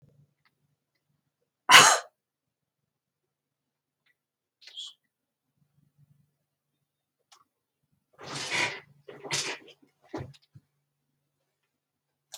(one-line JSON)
{"cough_length": "12.4 s", "cough_amplitude": 31516, "cough_signal_mean_std_ratio": 0.17, "survey_phase": "beta (2021-08-13 to 2022-03-07)", "age": "65+", "gender": "Female", "wearing_mask": "No", "symptom_none": true, "smoker_status": "Ex-smoker", "respiratory_condition_asthma": false, "respiratory_condition_other": false, "recruitment_source": "REACT", "submission_delay": "6 days", "covid_test_result": "Negative", "covid_test_method": "RT-qPCR", "influenza_a_test_result": "Negative", "influenza_b_test_result": "Negative"}